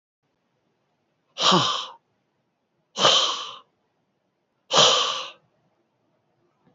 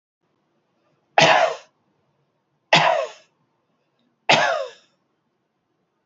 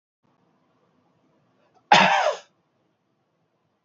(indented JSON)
{
  "exhalation_length": "6.7 s",
  "exhalation_amplitude": 24222,
  "exhalation_signal_mean_std_ratio": 0.35,
  "three_cough_length": "6.1 s",
  "three_cough_amplitude": 28157,
  "three_cough_signal_mean_std_ratio": 0.32,
  "cough_length": "3.8 s",
  "cough_amplitude": 27267,
  "cough_signal_mean_std_ratio": 0.26,
  "survey_phase": "beta (2021-08-13 to 2022-03-07)",
  "age": "65+",
  "gender": "Male",
  "wearing_mask": "No",
  "symptom_none": true,
  "symptom_onset": "12 days",
  "smoker_status": "Never smoked",
  "respiratory_condition_asthma": false,
  "respiratory_condition_other": false,
  "recruitment_source": "REACT",
  "submission_delay": "2 days",
  "covid_test_result": "Negative",
  "covid_test_method": "RT-qPCR"
}